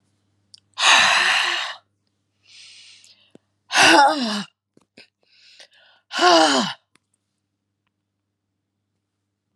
{
  "exhalation_length": "9.6 s",
  "exhalation_amplitude": 30064,
  "exhalation_signal_mean_std_ratio": 0.37,
  "survey_phase": "alpha (2021-03-01 to 2021-08-12)",
  "age": "45-64",
  "gender": "Female",
  "wearing_mask": "No",
  "symptom_cough_any": true,
  "symptom_headache": true,
  "symptom_change_to_sense_of_smell_or_taste": true,
  "symptom_onset": "6 days",
  "smoker_status": "Prefer not to say",
  "respiratory_condition_asthma": false,
  "respiratory_condition_other": false,
  "recruitment_source": "Test and Trace",
  "submission_delay": "1 day",
  "covid_test_result": "Positive",
  "covid_test_method": "RT-qPCR"
}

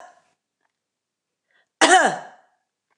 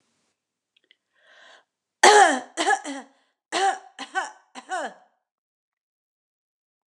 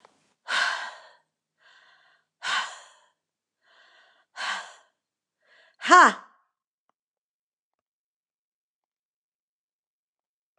{
  "cough_length": "3.0 s",
  "cough_amplitude": 29081,
  "cough_signal_mean_std_ratio": 0.26,
  "three_cough_length": "6.9 s",
  "three_cough_amplitude": 29203,
  "three_cough_signal_mean_std_ratio": 0.29,
  "exhalation_length": "10.6 s",
  "exhalation_amplitude": 25710,
  "exhalation_signal_mean_std_ratio": 0.2,
  "survey_phase": "beta (2021-08-13 to 2022-03-07)",
  "age": "45-64",
  "gender": "Female",
  "wearing_mask": "No",
  "symptom_new_continuous_cough": true,
  "symptom_sore_throat": true,
  "symptom_diarrhoea": true,
  "symptom_fatigue": true,
  "symptom_onset": "8 days",
  "smoker_status": "Never smoked",
  "respiratory_condition_asthma": false,
  "respiratory_condition_other": false,
  "recruitment_source": "Test and Trace",
  "submission_delay": "1 day",
  "covid_test_result": "Negative",
  "covid_test_method": "RT-qPCR"
}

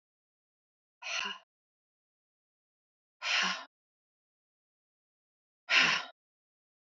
{
  "exhalation_length": "7.0 s",
  "exhalation_amplitude": 10346,
  "exhalation_signal_mean_std_ratio": 0.27,
  "survey_phase": "alpha (2021-03-01 to 2021-08-12)",
  "age": "45-64",
  "gender": "Female",
  "wearing_mask": "No",
  "symptom_none": true,
  "smoker_status": "Ex-smoker",
  "respiratory_condition_asthma": false,
  "respiratory_condition_other": false,
  "recruitment_source": "REACT",
  "submission_delay": "1 day",
  "covid_test_result": "Negative",
  "covid_test_method": "RT-qPCR"
}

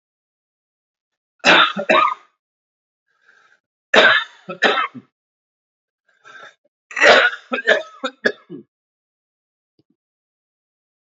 {
  "three_cough_length": "11.0 s",
  "three_cough_amplitude": 30316,
  "three_cough_signal_mean_std_ratio": 0.32,
  "survey_phase": "beta (2021-08-13 to 2022-03-07)",
  "age": "45-64",
  "gender": "Male",
  "wearing_mask": "No",
  "symptom_cough_any": true,
  "symptom_runny_or_blocked_nose": true,
  "symptom_sore_throat": true,
  "symptom_change_to_sense_of_smell_or_taste": true,
  "symptom_onset": "5 days",
  "smoker_status": "Never smoked",
  "respiratory_condition_asthma": false,
  "respiratory_condition_other": false,
  "recruitment_source": "Test and Trace",
  "submission_delay": "2 days",
  "covid_test_result": "Positive",
  "covid_test_method": "RT-qPCR",
  "covid_ct_value": 20.6,
  "covid_ct_gene": "N gene",
  "covid_ct_mean": 21.6,
  "covid_viral_load": "85000 copies/ml",
  "covid_viral_load_category": "Low viral load (10K-1M copies/ml)"
}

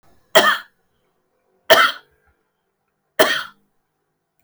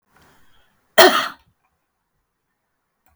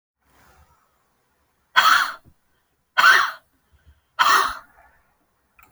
{
  "three_cough_length": "4.4 s",
  "three_cough_amplitude": 32768,
  "three_cough_signal_mean_std_ratio": 0.29,
  "cough_length": "3.2 s",
  "cough_amplitude": 32768,
  "cough_signal_mean_std_ratio": 0.22,
  "exhalation_length": "5.7 s",
  "exhalation_amplitude": 32768,
  "exhalation_signal_mean_std_ratio": 0.33,
  "survey_phase": "alpha (2021-03-01 to 2021-08-12)",
  "age": "45-64",
  "gender": "Female",
  "wearing_mask": "No",
  "symptom_none": true,
  "smoker_status": "Never smoked",
  "respiratory_condition_asthma": false,
  "respiratory_condition_other": false,
  "recruitment_source": "REACT",
  "submission_delay": "1 day",
  "covid_test_result": "Negative",
  "covid_test_method": "RT-qPCR"
}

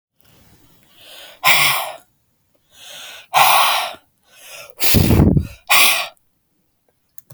{
  "exhalation_length": "7.3 s",
  "exhalation_amplitude": 32768,
  "exhalation_signal_mean_std_ratio": 0.44,
  "survey_phase": "beta (2021-08-13 to 2022-03-07)",
  "age": "45-64",
  "gender": "Female",
  "wearing_mask": "No",
  "symptom_runny_or_blocked_nose": true,
  "smoker_status": "Never smoked",
  "respiratory_condition_asthma": true,
  "respiratory_condition_other": false,
  "recruitment_source": "REACT",
  "submission_delay": "3 days",
  "covid_test_result": "Negative",
  "covid_test_method": "RT-qPCR",
  "influenza_a_test_result": "Negative",
  "influenza_b_test_result": "Negative"
}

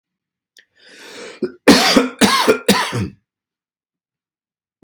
{
  "three_cough_length": "4.8 s",
  "three_cough_amplitude": 32768,
  "three_cough_signal_mean_std_ratio": 0.39,
  "survey_phase": "beta (2021-08-13 to 2022-03-07)",
  "age": "18-44",
  "gender": "Male",
  "wearing_mask": "No",
  "symptom_none": true,
  "smoker_status": "Ex-smoker",
  "respiratory_condition_asthma": false,
  "respiratory_condition_other": false,
  "recruitment_source": "REACT",
  "submission_delay": "0 days",
  "covid_test_result": "Negative",
  "covid_test_method": "RT-qPCR",
  "influenza_a_test_result": "Negative",
  "influenza_b_test_result": "Negative"
}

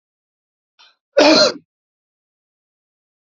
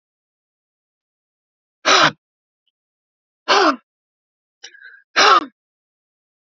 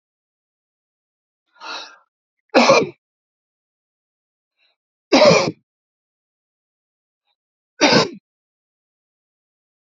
{
  "cough_length": "3.2 s",
  "cough_amplitude": 31212,
  "cough_signal_mean_std_ratio": 0.27,
  "exhalation_length": "6.6 s",
  "exhalation_amplitude": 32767,
  "exhalation_signal_mean_std_ratio": 0.28,
  "three_cough_length": "9.9 s",
  "three_cough_amplitude": 32768,
  "three_cough_signal_mean_std_ratio": 0.25,
  "survey_phase": "alpha (2021-03-01 to 2021-08-12)",
  "age": "45-64",
  "gender": "Male",
  "wearing_mask": "No",
  "symptom_none": true,
  "smoker_status": "Never smoked",
  "respiratory_condition_asthma": false,
  "respiratory_condition_other": false,
  "recruitment_source": "REACT",
  "submission_delay": "1 day",
  "covid_test_result": "Negative",
  "covid_test_method": "RT-qPCR"
}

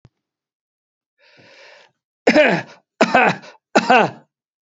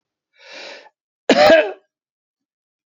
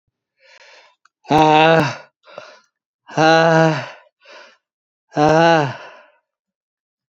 {
  "three_cough_length": "4.7 s",
  "three_cough_amplitude": 32767,
  "three_cough_signal_mean_std_ratio": 0.36,
  "cough_length": "2.9 s",
  "cough_amplitude": 32331,
  "cough_signal_mean_std_ratio": 0.31,
  "exhalation_length": "7.2 s",
  "exhalation_amplitude": 29905,
  "exhalation_signal_mean_std_ratio": 0.4,
  "survey_phase": "beta (2021-08-13 to 2022-03-07)",
  "age": "65+",
  "gender": "Male",
  "wearing_mask": "No",
  "symptom_none": true,
  "smoker_status": "Ex-smoker",
  "respiratory_condition_asthma": false,
  "respiratory_condition_other": false,
  "recruitment_source": "Test and Trace",
  "submission_delay": "0 days",
  "covid_test_result": "Negative",
  "covid_test_method": "RT-qPCR"
}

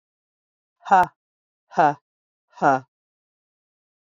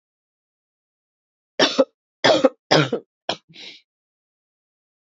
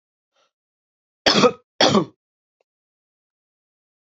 {
  "exhalation_length": "4.1 s",
  "exhalation_amplitude": 24799,
  "exhalation_signal_mean_std_ratio": 0.26,
  "three_cough_length": "5.1 s",
  "three_cough_amplitude": 29921,
  "three_cough_signal_mean_std_ratio": 0.28,
  "cough_length": "4.2 s",
  "cough_amplitude": 30131,
  "cough_signal_mean_std_ratio": 0.26,
  "survey_phase": "beta (2021-08-13 to 2022-03-07)",
  "age": "45-64",
  "gender": "Female",
  "wearing_mask": "No",
  "symptom_runny_or_blocked_nose": true,
  "symptom_sore_throat": true,
  "symptom_fatigue": true,
  "symptom_headache": true,
  "symptom_onset": "2 days",
  "smoker_status": "Ex-smoker",
  "respiratory_condition_asthma": false,
  "respiratory_condition_other": false,
  "recruitment_source": "Test and Trace",
  "submission_delay": "1 day",
  "covid_test_result": "Positive",
  "covid_test_method": "RT-qPCR",
  "covid_ct_value": 20.0,
  "covid_ct_gene": "ORF1ab gene",
  "covid_ct_mean": 20.3,
  "covid_viral_load": "230000 copies/ml",
  "covid_viral_load_category": "Low viral load (10K-1M copies/ml)"
}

